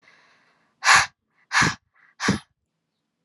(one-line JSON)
{"exhalation_length": "3.2 s", "exhalation_amplitude": 25535, "exhalation_signal_mean_std_ratio": 0.32, "survey_phase": "alpha (2021-03-01 to 2021-08-12)", "age": "18-44", "gender": "Female", "wearing_mask": "No", "symptom_none": true, "smoker_status": "Never smoked", "respiratory_condition_asthma": false, "respiratory_condition_other": false, "recruitment_source": "REACT", "submission_delay": "1 day", "covid_test_result": "Negative", "covid_test_method": "RT-qPCR"}